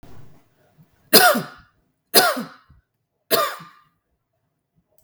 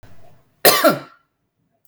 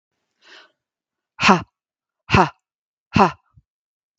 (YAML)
three_cough_length: 5.0 s
three_cough_amplitude: 32768
three_cough_signal_mean_std_ratio: 0.3
cough_length: 1.9 s
cough_amplitude: 32768
cough_signal_mean_std_ratio: 0.34
exhalation_length: 4.2 s
exhalation_amplitude: 32768
exhalation_signal_mean_std_ratio: 0.26
survey_phase: beta (2021-08-13 to 2022-03-07)
age: 45-64
gender: Female
wearing_mask: 'No'
symptom_none: true
smoker_status: Ex-smoker
respiratory_condition_asthma: false
respiratory_condition_other: false
recruitment_source: REACT
submission_delay: 1 day
covid_test_result: Negative
covid_test_method: RT-qPCR
influenza_a_test_result: Unknown/Void
influenza_b_test_result: Unknown/Void